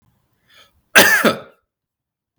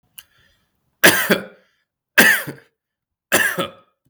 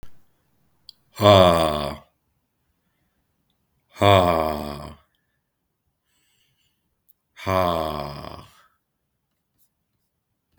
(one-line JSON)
{"cough_length": "2.4 s", "cough_amplitude": 32768, "cough_signal_mean_std_ratio": 0.32, "three_cough_length": "4.1 s", "three_cough_amplitude": 32766, "three_cough_signal_mean_std_ratio": 0.35, "exhalation_length": "10.6 s", "exhalation_amplitude": 32218, "exhalation_signal_mean_std_ratio": 0.29, "survey_phase": "beta (2021-08-13 to 2022-03-07)", "age": "18-44", "gender": "Male", "wearing_mask": "No", "symptom_cough_any": true, "symptom_runny_or_blocked_nose": true, "symptom_sore_throat": true, "symptom_fatigue": true, "symptom_headache": true, "symptom_onset": "3 days", "smoker_status": "Never smoked", "respiratory_condition_asthma": false, "respiratory_condition_other": false, "recruitment_source": "Test and Trace", "submission_delay": "1 day", "covid_test_result": "Positive", "covid_test_method": "RT-qPCR", "covid_ct_value": 18.6, "covid_ct_gene": "N gene", "covid_ct_mean": 19.7, "covid_viral_load": "340000 copies/ml", "covid_viral_load_category": "Low viral load (10K-1M copies/ml)"}